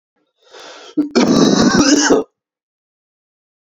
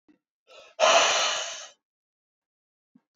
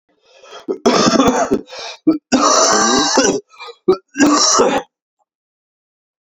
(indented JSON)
{
  "cough_length": "3.8 s",
  "cough_amplitude": 32462,
  "cough_signal_mean_std_ratio": 0.5,
  "exhalation_length": "3.2 s",
  "exhalation_amplitude": 13321,
  "exhalation_signal_mean_std_ratio": 0.38,
  "three_cough_length": "6.2 s",
  "three_cough_amplitude": 32120,
  "three_cough_signal_mean_std_ratio": 0.6,
  "survey_phase": "alpha (2021-03-01 to 2021-08-12)",
  "age": "18-44",
  "gender": "Male",
  "wearing_mask": "No",
  "symptom_cough_any": true,
  "symptom_fatigue": true,
  "symptom_headache": true,
  "symptom_onset": "5 days",
  "smoker_status": "Ex-smoker",
  "respiratory_condition_asthma": false,
  "respiratory_condition_other": false,
  "recruitment_source": "Test and Trace",
  "submission_delay": "4 days",
  "covid_test_result": "Positive",
  "covid_test_method": "RT-qPCR",
  "covid_ct_value": 16.8,
  "covid_ct_gene": "N gene",
  "covid_ct_mean": 16.8,
  "covid_viral_load": "3100000 copies/ml",
  "covid_viral_load_category": "High viral load (>1M copies/ml)"
}